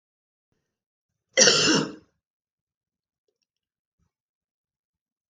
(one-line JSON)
{"cough_length": "5.3 s", "cough_amplitude": 26105, "cough_signal_mean_std_ratio": 0.24, "survey_phase": "beta (2021-08-13 to 2022-03-07)", "age": "65+", "gender": "Female", "wearing_mask": "No", "symptom_cough_any": true, "symptom_runny_or_blocked_nose": true, "symptom_sore_throat": true, "symptom_onset": "7 days", "smoker_status": "Never smoked", "respiratory_condition_asthma": false, "respiratory_condition_other": false, "recruitment_source": "REACT", "submission_delay": "1 day", "covid_test_result": "Negative", "covid_test_method": "RT-qPCR", "influenza_a_test_result": "Negative", "influenza_b_test_result": "Negative"}